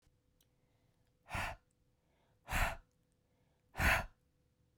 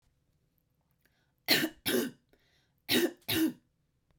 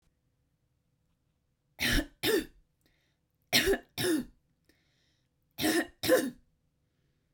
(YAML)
exhalation_length: 4.8 s
exhalation_amplitude: 3392
exhalation_signal_mean_std_ratio: 0.31
cough_length: 4.2 s
cough_amplitude: 8577
cough_signal_mean_std_ratio: 0.38
three_cough_length: 7.3 s
three_cough_amplitude: 9118
three_cough_signal_mean_std_ratio: 0.37
survey_phase: beta (2021-08-13 to 2022-03-07)
age: 18-44
gender: Female
wearing_mask: 'No'
symptom_none: true
symptom_onset: 4 days
smoker_status: Never smoked
respiratory_condition_asthma: false
respiratory_condition_other: false
recruitment_source: Test and Trace
submission_delay: 3 days
covid_test_result: Negative
covid_test_method: RT-qPCR